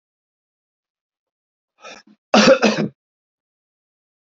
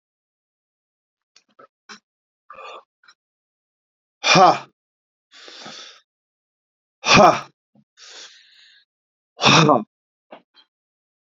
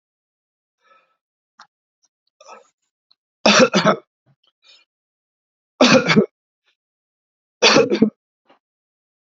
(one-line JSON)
{"cough_length": "4.4 s", "cough_amplitude": 28159, "cough_signal_mean_std_ratio": 0.26, "exhalation_length": "11.3 s", "exhalation_amplitude": 32468, "exhalation_signal_mean_std_ratio": 0.25, "three_cough_length": "9.2 s", "three_cough_amplitude": 32189, "three_cough_signal_mean_std_ratio": 0.29, "survey_phase": "beta (2021-08-13 to 2022-03-07)", "age": "65+", "gender": "Male", "wearing_mask": "No", "symptom_runny_or_blocked_nose": true, "smoker_status": "Ex-smoker", "respiratory_condition_asthma": false, "respiratory_condition_other": false, "recruitment_source": "Test and Trace", "submission_delay": "2 days", "covid_test_result": "Positive", "covid_test_method": "RT-qPCR", "covid_ct_value": 18.6, "covid_ct_gene": "ORF1ab gene", "covid_ct_mean": 18.7, "covid_viral_load": "720000 copies/ml", "covid_viral_load_category": "Low viral load (10K-1M copies/ml)"}